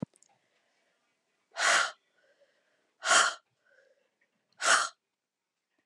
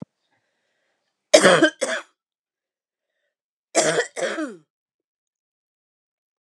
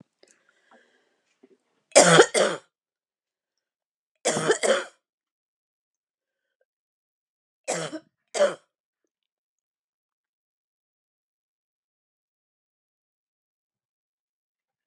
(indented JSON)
{
  "exhalation_length": "5.9 s",
  "exhalation_amplitude": 10587,
  "exhalation_signal_mean_std_ratio": 0.3,
  "cough_length": "6.4 s",
  "cough_amplitude": 32767,
  "cough_signal_mean_std_ratio": 0.28,
  "three_cough_length": "14.9 s",
  "three_cough_amplitude": 28292,
  "three_cough_signal_mean_std_ratio": 0.21,
  "survey_phase": "beta (2021-08-13 to 2022-03-07)",
  "age": "45-64",
  "gender": "Female",
  "wearing_mask": "No",
  "symptom_cough_any": true,
  "symptom_change_to_sense_of_smell_or_taste": true,
  "symptom_onset": "11 days",
  "smoker_status": "Never smoked",
  "respiratory_condition_asthma": false,
  "respiratory_condition_other": false,
  "recruitment_source": "REACT",
  "submission_delay": "2 days",
  "covid_test_result": "Negative",
  "covid_test_method": "RT-qPCR",
  "influenza_a_test_result": "Unknown/Void",
  "influenza_b_test_result": "Unknown/Void"
}